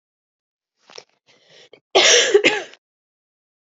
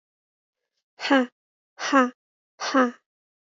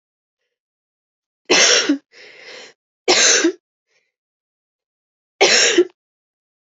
{"cough_length": "3.7 s", "cough_amplitude": 31117, "cough_signal_mean_std_ratio": 0.32, "exhalation_length": "3.4 s", "exhalation_amplitude": 17903, "exhalation_signal_mean_std_ratio": 0.35, "three_cough_length": "6.7 s", "three_cough_amplitude": 32768, "three_cough_signal_mean_std_ratio": 0.37, "survey_phase": "alpha (2021-03-01 to 2021-08-12)", "age": "18-44", "gender": "Female", "wearing_mask": "No", "symptom_cough_any": true, "symptom_new_continuous_cough": true, "symptom_fever_high_temperature": true, "symptom_headache": true, "symptom_change_to_sense_of_smell_or_taste": true, "symptom_loss_of_taste": true, "smoker_status": "Never smoked", "respiratory_condition_asthma": false, "respiratory_condition_other": false, "recruitment_source": "Test and Trace", "submission_delay": "2 days", "covid_test_result": "Positive", "covid_test_method": "RT-qPCR", "covid_ct_value": 18.8, "covid_ct_gene": "ORF1ab gene"}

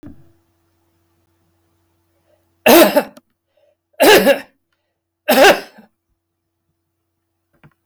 {"three_cough_length": "7.9 s", "three_cough_amplitude": 32768, "three_cough_signal_mean_std_ratio": 0.3, "survey_phase": "beta (2021-08-13 to 2022-03-07)", "age": "65+", "gender": "Male", "wearing_mask": "No", "symptom_none": true, "smoker_status": "Never smoked", "respiratory_condition_asthma": false, "respiratory_condition_other": false, "recruitment_source": "REACT", "submission_delay": "3 days", "covid_test_result": "Negative", "covid_test_method": "RT-qPCR", "influenza_a_test_result": "Negative", "influenza_b_test_result": "Negative"}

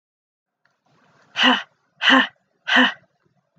{"exhalation_length": "3.6 s", "exhalation_amplitude": 25622, "exhalation_signal_mean_std_ratio": 0.35, "survey_phase": "beta (2021-08-13 to 2022-03-07)", "age": "18-44", "gender": "Female", "wearing_mask": "No", "symptom_cough_any": true, "symptom_runny_or_blocked_nose": true, "symptom_sore_throat": true, "symptom_fatigue": true, "symptom_onset": "4 days", "smoker_status": "Never smoked", "respiratory_condition_asthma": true, "respiratory_condition_other": false, "recruitment_source": "Test and Trace", "submission_delay": "2 days", "covid_test_result": "Positive", "covid_test_method": "RT-qPCR", "covid_ct_value": 20.6, "covid_ct_gene": "ORF1ab gene", "covid_ct_mean": 20.7, "covid_viral_load": "160000 copies/ml", "covid_viral_load_category": "Low viral load (10K-1M copies/ml)"}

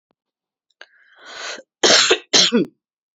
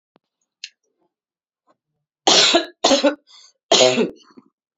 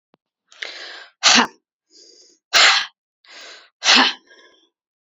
{"cough_length": "3.2 s", "cough_amplitude": 30829, "cough_signal_mean_std_ratio": 0.38, "three_cough_length": "4.8 s", "three_cough_amplitude": 30421, "three_cough_signal_mean_std_ratio": 0.37, "exhalation_length": "5.1 s", "exhalation_amplitude": 32768, "exhalation_signal_mean_std_ratio": 0.34, "survey_phase": "beta (2021-08-13 to 2022-03-07)", "age": "18-44", "gender": "Female", "wearing_mask": "No", "symptom_none": true, "symptom_onset": "5 days", "smoker_status": "Ex-smoker", "respiratory_condition_asthma": true, "respiratory_condition_other": false, "recruitment_source": "REACT", "submission_delay": "2 days", "covid_test_result": "Negative", "covid_test_method": "RT-qPCR", "influenza_a_test_result": "Negative", "influenza_b_test_result": "Negative"}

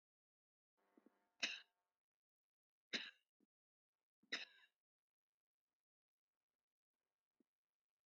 {"three_cough_length": "8.1 s", "three_cough_amplitude": 1393, "three_cough_signal_mean_std_ratio": 0.17, "survey_phase": "beta (2021-08-13 to 2022-03-07)", "age": "65+", "gender": "Female", "wearing_mask": "No", "symptom_shortness_of_breath": true, "symptom_loss_of_taste": true, "smoker_status": "Ex-smoker", "respiratory_condition_asthma": false, "respiratory_condition_other": true, "recruitment_source": "REACT", "submission_delay": "5 days", "covid_test_result": "Negative", "covid_test_method": "RT-qPCR", "influenza_a_test_result": "Negative", "influenza_b_test_result": "Negative"}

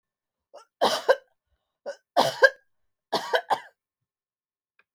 {"three_cough_length": "4.9 s", "three_cough_amplitude": 22788, "three_cough_signal_mean_std_ratio": 0.29, "survey_phase": "beta (2021-08-13 to 2022-03-07)", "age": "45-64", "gender": "Female", "wearing_mask": "No", "symptom_none": true, "smoker_status": "Never smoked", "respiratory_condition_asthma": false, "respiratory_condition_other": false, "recruitment_source": "REACT", "submission_delay": "1 day", "covid_test_result": "Negative", "covid_test_method": "RT-qPCR"}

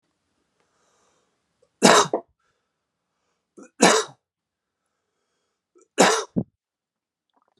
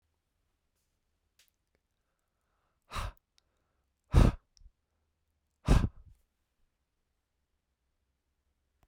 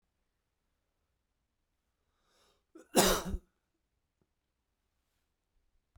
{"three_cough_length": "7.6 s", "three_cough_amplitude": 32767, "three_cough_signal_mean_std_ratio": 0.24, "exhalation_length": "8.9 s", "exhalation_amplitude": 9968, "exhalation_signal_mean_std_ratio": 0.18, "cough_length": "6.0 s", "cough_amplitude": 11506, "cough_signal_mean_std_ratio": 0.19, "survey_phase": "beta (2021-08-13 to 2022-03-07)", "age": "18-44", "gender": "Male", "wearing_mask": "No", "symptom_none": true, "smoker_status": "Never smoked", "respiratory_condition_asthma": true, "respiratory_condition_other": false, "recruitment_source": "REACT", "submission_delay": "5 days", "covid_test_result": "Negative", "covid_test_method": "RT-qPCR"}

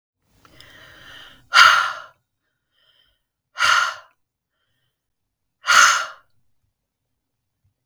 {"exhalation_length": "7.9 s", "exhalation_amplitude": 32768, "exhalation_signal_mean_std_ratio": 0.29, "survey_phase": "beta (2021-08-13 to 2022-03-07)", "age": "45-64", "gender": "Female", "wearing_mask": "No", "symptom_none": true, "smoker_status": "Ex-smoker", "respiratory_condition_asthma": false, "respiratory_condition_other": false, "recruitment_source": "REACT", "submission_delay": "1 day", "covid_test_result": "Negative", "covid_test_method": "RT-qPCR", "influenza_a_test_result": "Negative", "influenza_b_test_result": "Negative"}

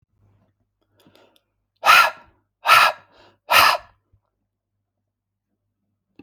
{"exhalation_length": "6.2 s", "exhalation_amplitude": 31854, "exhalation_signal_mean_std_ratio": 0.28, "survey_phase": "alpha (2021-03-01 to 2021-08-12)", "age": "18-44", "gender": "Male", "wearing_mask": "No", "symptom_none": true, "smoker_status": "Ex-smoker", "respiratory_condition_asthma": false, "respiratory_condition_other": false, "recruitment_source": "REACT", "submission_delay": "2 days", "covid_test_result": "Negative", "covid_test_method": "RT-qPCR"}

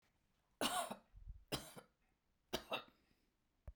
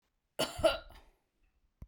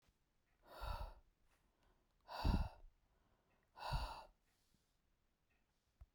{"three_cough_length": "3.8 s", "three_cough_amplitude": 1852, "three_cough_signal_mean_std_ratio": 0.37, "cough_length": "1.9 s", "cough_amplitude": 5979, "cough_signal_mean_std_ratio": 0.31, "exhalation_length": "6.1 s", "exhalation_amplitude": 1686, "exhalation_signal_mean_std_ratio": 0.33, "survey_phase": "beta (2021-08-13 to 2022-03-07)", "age": "65+", "gender": "Female", "wearing_mask": "No", "symptom_none": true, "smoker_status": "Never smoked", "respiratory_condition_asthma": false, "respiratory_condition_other": false, "recruitment_source": "REACT", "submission_delay": "2 days", "covid_test_result": "Negative", "covid_test_method": "RT-qPCR"}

